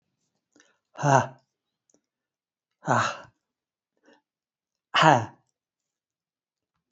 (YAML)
exhalation_length: 6.9 s
exhalation_amplitude: 24557
exhalation_signal_mean_std_ratio: 0.24
survey_phase: beta (2021-08-13 to 2022-03-07)
age: 65+
gender: Male
wearing_mask: 'No'
symptom_none: true
smoker_status: Never smoked
respiratory_condition_asthma: false
respiratory_condition_other: false
recruitment_source: REACT
submission_delay: 2 days
covid_test_result: Negative
covid_test_method: RT-qPCR